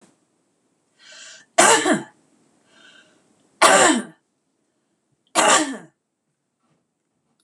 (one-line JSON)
{"three_cough_length": "7.4 s", "three_cough_amplitude": 26028, "three_cough_signal_mean_std_ratio": 0.32, "survey_phase": "beta (2021-08-13 to 2022-03-07)", "age": "65+", "gender": "Female", "wearing_mask": "No", "symptom_none": true, "smoker_status": "Ex-smoker", "respiratory_condition_asthma": false, "respiratory_condition_other": false, "recruitment_source": "REACT", "submission_delay": "0 days", "covid_test_result": "Negative", "covid_test_method": "RT-qPCR", "influenza_a_test_result": "Negative", "influenza_b_test_result": "Negative"}